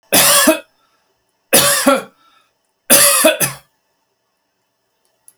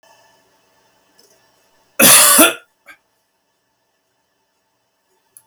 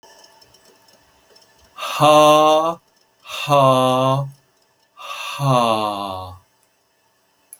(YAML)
three_cough_length: 5.4 s
three_cough_amplitude: 32768
three_cough_signal_mean_std_ratio: 0.44
cough_length: 5.5 s
cough_amplitude: 32768
cough_signal_mean_std_ratio: 0.26
exhalation_length: 7.6 s
exhalation_amplitude: 31264
exhalation_signal_mean_std_ratio: 0.47
survey_phase: beta (2021-08-13 to 2022-03-07)
age: 65+
gender: Male
wearing_mask: 'No'
symptom_sore_throat: true
symptom_fatigue: true
smoker_status: Never smoked
respiratory_condition_asthma: false
respiratory_condition_other: false
recruitment_source: REACT
submission_delay: 2 days
covid_test_result: Negative
covid_test_method: RT-qPCR